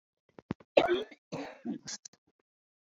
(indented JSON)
{
  "cough_length": "3.0 s",
  "cough_amplitude": 12640,
  "cough_signal_mean_std_ratio": 0.29,
  "survey_phase": "beta (2021-08-13 to 2022-03-07)",
  "age": "65+",
  "gender": "Female",
  "wearing_mask": "No",
  "symptom_cough_any": true,
  "symptom_fatigue": true,
  "smoker_status": "Never smoked",
  "respiratory_condition_asthma": true,
  "respiratory_condition_other": false,
  "recruitment_source": "REACT",
  "submission_delay": "2 days",
  "covid_test_result": "Negative",
  "covid_test_method": "RT-qPCR"
}